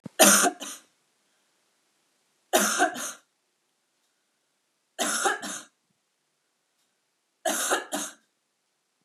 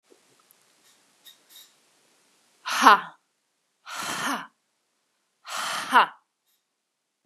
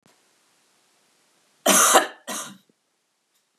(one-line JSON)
{"three_cough_length": "9.0 s", "three_cough_amplitude": 29012, "three_cough_signal_mean_std_ratio": 0.32, "exhalation_length": "7.3 s", "exhalation_amplitude": 31452, "exhalation_signal_mean_std_ratio": 0.25, "cough_length": "3.6 s", "cough_amplitude": 30763, "cough_signal_mean_std_ratio": 0.29, "survey_phase": "beta (2021-08-13 to 2022-03-07)", "age": "18-44", "gender": "Female", "wearing_mask": "No", "symptom_none": true, "smoker_status": "Never smoked", "respiratory_condition_asthma": false, "respiratory_condition_other": false, "recruitment_source": "REACT", "submission_delay": "0 days", "covid_test_result": "Negative", "covid_test_method": "RT-qPCR", "influenza_a_test_result": "Negative", "influenza_b_test_result": "Negative"}